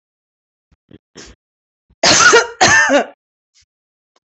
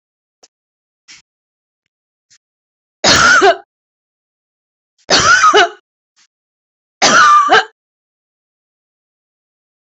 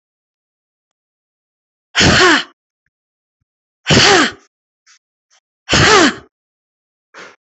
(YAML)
cough_length: 4.4 s
cough_amplitude: 32767
cough_signal_mean_std_ratio: 0.38
three_cough_length: 9.9 s
three_cough_amplitude: 31545
three_cough_signal_mean_std_ratio: 0.36
exhalation_length: 7.6 s
exhalation_amplitude: 32768
exhalation_signal_mean_std_ratio: 0.36
survey_phase: beta (2021-08-13 to 2022-03-07)
age: 45-64
gender: Female
wearing_mask: 'No'
symptom_none: true
smoker_status: Ex-smoker
respiratory_condition_asthma: false
respiratory_condition_other: false
recruitment_source: REACT
submission_delay: 13 days
covid_test_result: Negative
covid_test_method: RT-qPCR
influenza_a_test_result: Negative
influenza_b_test_result: Negative